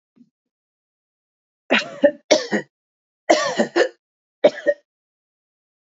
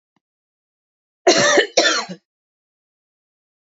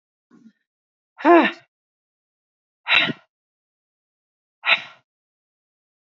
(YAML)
three_cough_length: 5.8 s
three_cough_amplitude: 27902
three_cough_signal_mean_std_ratio: 0.32
cough_length: 3.7 s
cough_amplitude: 32767
cough_signal_mean_std_ratio: 0.34
exhalation_length: 6.1 s
exhalation_amplitude: 27681
exhalation_signal_mean_std_ratio: 0.24
survey_phase: beta (2021-08-13 to 2022-03-07)
age: 45-64
gender: Female
wearing_mask: 'No'
symptom_none: true
smoker_status: Ex-smoker
respiratory_condition_asthma: true
respiratory_condition_other: false
recruitment_source: REACT
submission_delay: 1 day
covid_test_result: Negative
covid_test_method: RT-qPCR
influenza_a_test_result: Unknown/Void
influenza_b_test_result: Unknown/Void